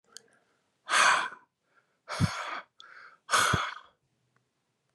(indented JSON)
{
  "exhalation_length": "4.9 s",
  "exhalation_amplitude": 10768,
  "exhalation_signal_mean_std_ratio": 0.38,
  "survey_phase": "beta (2021-08-13 to 2022-03-07)",
  "age": "18-44",
  "gender": "Male",
  "wearing_mask": "No",
  "symptom_none": true,
  "smoker_status": "Never smoked",
  "respiratory_condition_asthma": false,
  "respiratory_condition_other": false,
  "recruitment_source": "REACT",
  "submission_delay": "1 day",
  "covid_test_result": "Negative",
  "covid_test_method": "RT-qPCR",
  "influenza_a_test_result": "Negative",
  "influenza_b_test_result": "Negative"
}